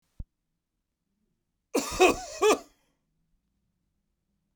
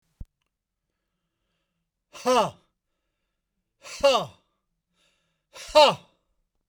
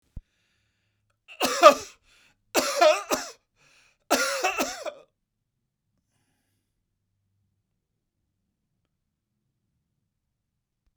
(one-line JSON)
{"cough_length": "4.6 s", "cough_amplitude": 14136, "cough_signal_mean_std_ratio": 0.27, "exhalation_length": "6.7 s", "exhalation_amplitude": 19618, "exhalation_signal_mean_std_ratio": 0.25, "three_cough_length": "11.0 s", "three_cough_amplitude": 32767, "three_cough_signal_mean_std_ratio": 0.24, "survey_phase": "beta (2021-08-13 to 2022-03-07)", "age": "65+", "gender": "Male", "wearing_mask": "No", "symptom_none": true, "smoker_status": "Never smoked", "respiratory_condition_asthma": false, "respiratory_condition_other": false, "recruitment_source": "REACT", "submission_delay": "1 day", "covid_test_result": "Negative", "covid_test_method": "RT-qPCR", "influenza_a_test_result": "Negative", "influenza_b_test_result": "Negative"}